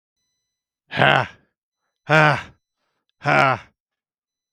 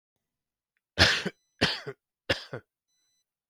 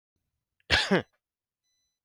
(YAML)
exhalation_length: 4.5 s
exhalation_amplitude: 32768
exhalation_signal_mean_std_ratio: 0.34
three_cough_length: 3.5 s
three_cough_amplitude: 16852
three_cough_signal_mean_std_ratio: 0.29
cough_length: 2.0 s
cough_amplitude: 19432
cough_signal_mean_std_ratio: 0.28
survey_phase: beta (2021-08-13 to 2022-03-07)
age: 45-64
gender: Male
wearing_mask: 'No'
symptom_none: true
smoker_status: Ex-smoker
respiratory_condition_asthma: false
respiratory_condition_other: false
recruitment_source: REACT
submission_delay: 1 day
covid_test_result: Negative
covid_test_method: RT-qPCR
influenza_a_test_result: Negative
influenza_b_test_result: Negative